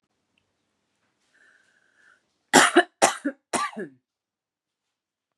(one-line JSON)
{"three_cough_length": "5.4 s", "three_cough_amplitude": 32267, "three_cough_signal_mean_std_ratio": 0.24, "survey_phase": "beta (2021-08-13 to 2022-03-07)", "age": "18-44", "gender": "Female", "wearing_mask": "No", "symptom_cough_any": true, "symptom_runny_or_blocked_nose": true, "symptom_sore_throat": true, "symptom_fatigue": true, "symptom_onset": "12 days", "smoker_status": "Ex-smoker", "respiratory_condition_asthma": true, "respiratory_condition_other": false, "recruitment_source": "REACT", "submission_delay": "0 days", "covid_test_result": "Negative", "covid_test_method": "RT-qPCR", "influenza_a_test_result": "Negative", "influenza_b_test_result": "Negative"}